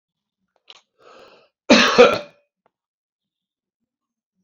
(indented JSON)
{
  "cough_length": "4.4 s",
  "cough_amplitude": 29391,
  "cough_signal_mean_std_ratio": 0.25,
  "survey_phase": "beta (2021-08-13 to 2022-03-07)",
  "age": "65+",
  "gender": "Male",
  "wearing_mask": "No",
  "symptom_none": true,
  "symptom_onset": "5 days",
  "smoker_status": "Ex-smoker",
  "respiratory_condition_asthma": true,
  "respiratory_condition_other": false,
  "recruitment_source": "REACT",
  "submission_delay": "2 days",
  "covid_test_result": "Negative",
  "covid_test_method": "RT-qPCR"
}